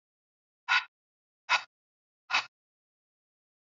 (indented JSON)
{
  "exhalation_length": "3.8 s",
  "exhalation_amplitude": 8068,
  "exhalation_signal_mean_std_ratio": 0.23,
  "survey_phase": "alpha (2021-03-01 to 2021-08-12)",
  "age": "45-64",
  "gender": "Female",
  "wearing_mask": "No",
  "symptom_none": true,
  "smoker_status": "Ex-smoker",
  "respiratory_condition_asthma": false,
  "respiratory_condition_other": false,
  "recruitment_source": "REACT",
  "submission_delay": "3 days",
  "covid_test_result": "Negative",
  "covid_test_method": "RT-qPCR"
}